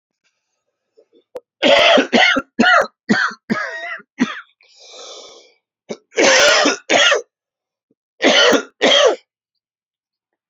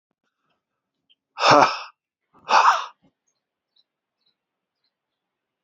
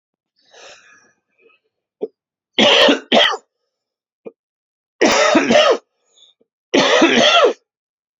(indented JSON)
{
  "cough_length": "10.5 s",
  "cough_amplitude": 32768,
  "cough_signal_mean_std_ratio": 0.48,
  "exhalation_length": "5.6 s",
  "exhalation_amplitude": 28188,
  "exhalation_signal_mean_std_ratio": 0.26,
  "three_cough_length": "8.2 s",
  "three_cough_amplitude": 32767,
  "three_cough_signal_mean_std_ratio": 0.45,
  "survey_phase": "alpha (2021-03-01 to 2021-08-12)",
  "age": "45-64",
  "gender": "Male",
  "wearing_mask": "No",
  "symptom_cough_any": true,
  "symptom_shortness_of_breath": true,
  "symptom_fatigue": true,
  "symptom_fever_high_temperature": true,
  "symptom_headache": true,
  "symptom_change_to_sense_of_smell_or_taste": true,
  "smoker_status": "Never smoked",
  "respiratory_condition_asthma": false,
  "respiratory_condition_other": false,
  "recruitment_source": "Test and Trace",
  "submission_delay": "2 days",
  "covid_test_result": "Positive",
  "covid_test_method": "RT-qPCR"
}